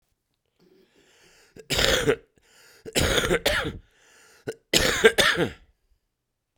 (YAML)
three_cough_length: 6.6 s
three_cough_amplitude: 32767
three_cough_signal_mean_std_ratio: 0.42
survey_phase: beta (2021-08-13 to 2022-03-07)
age: 45-64
gender: Male
wearing_mask: 'No'
symptom_cough_any: true
symptom_sore_throat: true
symptom_abdominal_pain: true
symptom_diarrhoea: true
symptom_fatigue: true
symptom_fever_high_temperature: true
symptom_headache: true
symptom_change_to_sense_of_smell_or_taste: true
symptom_loss_of_taste: true
symptom_onset: 4 days
smoker_status: Ex-smoker
respiratory_condition_asthma: false
respiratory_condition_other: false
recruitment_source: Test and Trace
submission_delay: 2 days
covid_test_result: Positive
covid_test_method: RT-qPCR
covid_ct_value: 12.0
covid_ct_gene: ORF1ab gene